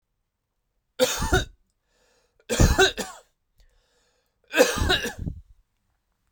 {
  "three_cough_length": "6.3 s",
  "three_cough_amplitude": 22883,
  "three_cough_signal_mean_std_ratio": 0.36,
  "survey_phase": "beta (2021-08-13 to 2022-03-07)",
  "age": "18-44",
  "gender": "Male",
  "wearing_mask": "No",
  "symptom_none": true,
  "smoker_status": "Never smoked",
  "respiratory_condition_asthma": false,
  "respiratory_condition_other": false,
  "recruitment_source": "REACT",
  "submission_delay": "2 days",
  "covid_test_result": "Negative",
  "covid_test_method": "RT-qPCR"
}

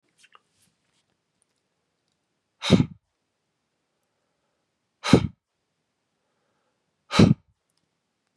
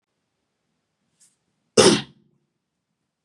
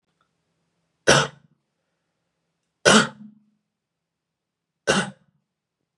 {
  "exhalation_length": "8.4 s",
  "exhalation_amplitude": 28934,
  "exhalation_signal_mean_std_ratio": 0.18,
  "cough_length": "3.2 s",
  "cough_amplitude": 32095,
  "cough_signal_mean_std_ratio": 0.2,
  "three_cough_length": "6.0 s",
  "three_cough_amplitude": 31298,
  "three_cough_signal_mean_std_ratio": 0.24,
  "survey_phase": "beta (2021-08-13 to 2022-03-07)",
  "age": "18-44",
  "gender": "Male",
  "wearing_mask": "No",
  "symptom_none": true,
  "smoker_status": "Never smoked",
  "respiratory_condition_asthma": false,
  "respiratory_condition_other": false,
  "recruitment_source": "REACT",
  "submission_delay": "3 days",
  "covid_test_result": "Negative",
  "covid_test_method": "RT-qPCR"
}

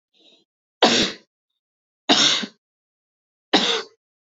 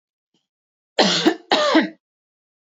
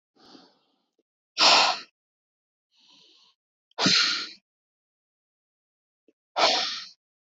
{
  "three_cough_length": "4.4 s",
  "three_cough_amplitude": 26971,
  "three_cough_signal_mean_std_ratio": 0.36,
  "cough_length": "2.7 s",
  "cough_amplitude": 27724,
  "cough_signal_mean_std_ratio": 0.41,
  "exhalation_length": "7.3 s",
  "exhalation_amplitude": 18907,
  "exhalation_signal_mean_std_ratio": 0.32,
  "survey_phase": "beta (2021-08-13 to 2022-03-07)",
  "age": "18-44",
  "gender": "Female",
  "wearing_mask": "No",
  "symptom_runny_or_blocked_nose": true,
  "smoker_status": "Never smoked",
  "respiratory_condition_asthma": false,
  "respiratory_condition_other": false,
  "recruitment_source": "REACT",
  "submission_delay": "0 days",
  "covid_test_result": "Negative",
  "covid_test_method": "RT-qPCR",
  "influenza_a_test_result": "Negative",
  "influenza_b_test_result": "Negative"
}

